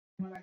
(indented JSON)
{
  "cough_length": "0.4 s",
  "cough_amplitude": 1395,
  "cough_signal_mean_std_ratio": 0.6,
  "survey_phase": "beta (2021-08-13 to 2022-03-07)",
  "age": "18-44",
  "gender": "Female",
  "wearing_mask": "No",
  "symptom_cough_any": true,
  "symptom_abdominal_pain": true,
  "symptom_onset": "12 days",
  "smoker_status": "Never smoked",
  "respiratory_condition_asthma": false,
  "respiratory_condition_other": false,
  "recruitment_source": "REACT",
  "submission_delay": "1 day",
  "covid_test_result": "Negative",
  "covid_test_method": "RT-qPCR",
  "influenza_a_test_result": "Positive",
  "influenza_a_ct_value": 31.5,
  "influenza_b_test_result": "Negative"
}